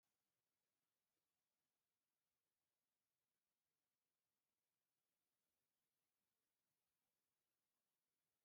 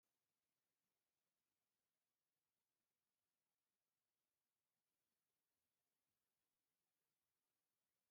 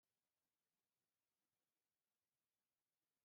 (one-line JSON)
{"exhalation_length": "8.4 s", "exhalation_amplitude": 3, "exhalation_signal_mean_std_ratio": 0.51, "three_cough_length": "8.1 s", "three_cough_amplitude": 4, "three_cough_signal_mean_std_ratio": 0.5, "cough_length": "3.2 s", "cough_amplitude": 3, "cough_signal_mean_std_ratio": 0.49, "survey_phase": "beta (2021-08-13 to 2022-03-07)", "age": "65+", "gender": "Male", "wearing_mask": "No", "symptom_cough_any": true, "symptom_shortness_of_breath": true, "smoker_status": "Ex-smoker", "respiratory_condition_asthma": false, "respiratory_condition_other": true, "recruitment_source": "REACT", "submission_delay": "1 day", "covid_test_result": "Negative", "covid_test_method": "RT-qPCR", "influenza_a_test_result": "Negative", "influenza_b_test_result": "Negative"}